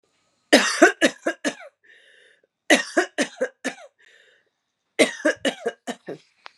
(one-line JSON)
{"three_cough_length": "6.6 s", "three_cough_amplitude": 30364, "three_cough_signal_mean_std_ratio": 0.34, "survey_phase": "beta (2021-08-13 to 2022-03-07)", "age": "18-44", "gender": "Female", "wearing_mask": "No", "symptom_none": true, "smoker_status": "Ex-smoker", "respiratory_condition_asthma": false, "respiratory_condition_other": false, "recruitment_source": "REACT", "submission_delay": "1 day", "covid_test_result": "Negative", "covid_test_method": "RT-qPCR", "influenza_a_test_result": "Negative", "influenza_b_test_result": "Negative"}